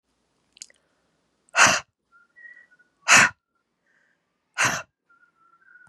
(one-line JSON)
{"exhalation_length": "5.9 s", "exhalation_amplitude": 27474, "exhalation_signal_mean_std_ratio": 0.25, "survey_phase": "beta (2021-08-13 to 2022-03-07)", "age": "18-44", "gender": "Female", "wearing_mask": "No", "symptom_runny_or_blocked_nose": true, "symptom_headache": true, "symptom_onset": "5 days", "smoker_status": "Ex-smoker", "respiratory_condition_asthma": false, "respiratory_condition_other": false, "recruitment_source": "Test and Trace", "submission_delay": "3 days", "covid_test_method": "RT-qPCR", "covid_ct_value": 31.5, "covid_ct_gene": "ORF1ab gene", "covid_ct_mean": 33.0, "covid_viral_load": "15 copies/ml", "covid_viral_load_category": "Minimal viral load (< 10K copies/ml)"}